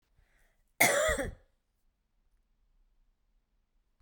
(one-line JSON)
{"cough_length": "4.0 s", "cough_amplitude": 12497, "cough_signal_mean_std_ratio": 0.28, "survey_phase": "beta (2021-08-13 to 2022-03-07)", "age": "45-64", "gender": "Female", "wearing_mask": "No", "symptom_none": true, "smoker_status": "Never smoked", "respiratory_condition_asthma": true, "respiratory_condition_other": false, "recruitment_source": "REACT", "submission_delay": "1 day", "covid_test_result": "Negative", "covid_test_method": "RT-qPCR"}